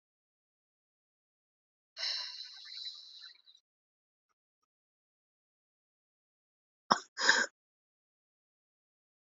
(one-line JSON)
{"exhalation_length": "9.3 s", "exhalation_amplitude": 17069, "exhalation_signal_mean_std_ratio": 0.2, "survey_phase": "alpha (2021-03-01 to 2021-08-12)", "age": "18-44", "gender": "Female", "wearing_mask": "Yes", "symptom_cough_any": true, "symptom_new_continuous_cough": true, "symptom_shortness_of_breath": true, "symptom_abdominal_pain": true, "symptom_fatigue": true, "symptom_fever_high_temperature": true, "symptom_headache": true, "symptom_change_to_sense_of_smell_or_taste": true, "symptom_loss_of_taste": true, "smoker_status": "Current smoker (1 to 10 cigarettes per day)", "respiratory_condition_asthma": false, "respiratory_condition_other": false, "recruitment_source": "Test and Trace", "submission_delay": "2 days", "covid_test_result": "Positive", "covid_test_method": "LFT"}